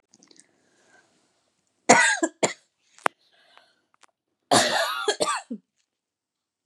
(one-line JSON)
{"cough_length": "6.7 s", "cough_amplitude": 30340, "cough_signal_mean_std_ratio": 0.31, "survey_phase": "beta (2021-08-13 to 2022-03-07)", "age": "18-44", "gender": "Female", "wearing_mask": "No", "symptom_new_continuous_cough": true, "symptom_runny_or_blocked_nose": true, "symptom_fatigue": true, "symptom_fever_high_temperature": true, "symptom_headache": true, "symptom_change_to_sense_of_smell_or_taste": true, "symptom_other": true, "symptom_onset": "2 days", "smoker_status": "Never smoked", "respiratory_condition_asthma": false, "respiratory_condition_other": false, "recruitment_source": "Test and Trace", "submission_delay": "1 day", "covid_test_result": "Positive", "covid_test_method": "RT-qPCR", "covid_ct_value": 18.3, "covid_ct_gene": "N gene"}